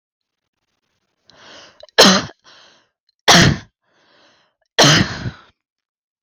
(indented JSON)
{
  "three_cough_length": "6.2 s",
  "three_cough_amplitude": 32768,
  "three_cough_signal_mean_std_ratio": 0.31,
  "survey_phase": "beta (2021-08-13 to 2022-03-07)",
  "age": "18-44",
  "gender": "Female",
  "wearing_mask": "No",
  "symptom_cough_any": true,
  "smoker_status": "Never smoked",
  "respiratory_condition_asthma": false,
  "respiratory_condition_other": false,
  "recruitment_source": "REACT",
  "submission_delay": "0 days",
  "covid_test_result": "Negative",
  "covid_test_method": "RT-qPCR",
  "influenza_a_test_result": "Negative",
  "influenza_b_test_result": "Negative"
}